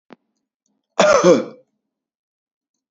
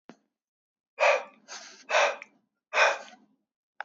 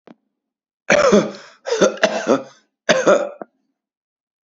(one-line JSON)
{"cough_length": "2.9 s", "cough_amplitude": 27882, "cough_signal_mean_std_ratio": 0.31, "exhalation_length": "3.8 s", "exhalation_amplitude": 13888, "exhalation_signal_mean_std_ratio": 0.36, "three_cough_length": "4.4 s", "three_cough_amplitude": 29012, "three_cough_signal_mean_std_ratio": 0.43, "survey_phase": "beta (2021-08-13 to 2022-03-07)", "age": "18-44", "gender": "Male", "wearing_mask": "No", "symptom_runny_or_blocked_nose": true, "symptom_onset": "5 days", "smoker_status": "Never smoked", "respiratory_condition_asthma": false, "respiratory_condition_other": false, "recruitment_source": "REACT", "submission_delay": "2 days", "covid_test_result": "Negative", "covid_test_method": "RT-qPCR", "influenza_a_test_result": "Negative", "influenza_b_test_result": "Negative"}